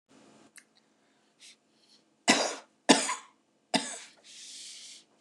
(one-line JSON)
{"three_cough_length": "5.2 s", "three_cough_amplitude": 18895, "three_cough_signal_mean_std_ratio": 0.28, "survey_phase": "beta (2021-08-13 to 2022-03-07)", "age": "45-64", "gender": "Female", "wearing_mask": "No", "symptom_none": true, "smoker_status": "Never smoked", "respiratory_condition_asthma": false, "respiratory_condition_other": false, "recruitment_source": "REACT", "submission_delay": "0 days", "covid_test_result": "Negative", "covid_test_method": "RT-qPCR", "influenza_a_test_result": "Negative", "influenza_b_test_result": "Negative"}